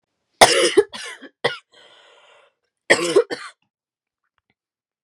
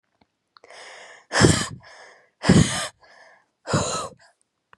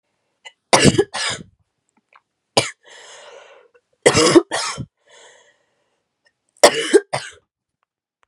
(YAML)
cough_length: 5.0 s
cough_amplitude: 32768
cough_signal_mean_std_ratio: 0.3
exhalation_length: 4.8 s
exhalation_amplitude: 29429
exhalation_signal_mean_std_ratio: 0.36
three_cough_length: 8.3 s
three_cough_amplitude: 32768
three_cough_signal_mean_std_ratio: 0.3
survey_phase: beta (2021-08-13 to 2022-03-07)
age: 18-44
gender: Female
wearing_mask: 'No'
symptom_cough_any: true
symptom_runny_or_blocked_nose: true
symptom_sore_throat: true
symptom_headache: true
symptom_change_to_sense_of_smell_or_taste: true
smoker_status: Ex-smoker
respiratory_condition_asthma: false
respiratory_condition_other: false
recruitment_source: Test and Trace
submission_delay: 0 days
covid_test_result: Positive
covid_test_method: LFT